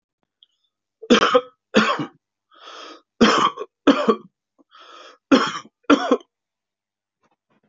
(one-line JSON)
{"three_cough_length": "7.7 s", "three_cough_amplitude": 31333, "three_cough_signal_mean_std_ratio": 0.35, "survey_phase": "alpha (2021-03-01 to 2021-08-12)", "age": "65+", "gender": "Male", "wearing_mask": "No", "symptom_none": true, "smoker_status": "Ex-smoker", "respiratory_condition_asthma": false, "respiratory_condition_other": true, "recruitment_source": "REACT", "submission_delay": "2 days", "covid_test_result": "Negative", "covid_test_method": "RT-qPCR"}